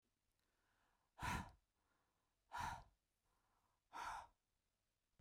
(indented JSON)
{
  "exhalation_length": "5.2 s",
  "exhalation_amplitude": 697,
  "exhalation_signal_mean_std_ratio": 0.34,
  "survey_phase": "beta (2021-08-13 to 2022-03-07)",
  "age": "18-44",
  "gender": "Female",
  "wearing_mask": "No",
  "symptom_none": true,
  "smoker_status": "Never smoked",
  "respiratory_condition_asthma": false,
  "respiratory_condition_other": false,
  "recruitment_source": "REACT",
  "submission_delay": "1 day",
  "covid_test_result": "Negative",
  "covid_test_method": "RT-qPCR"
}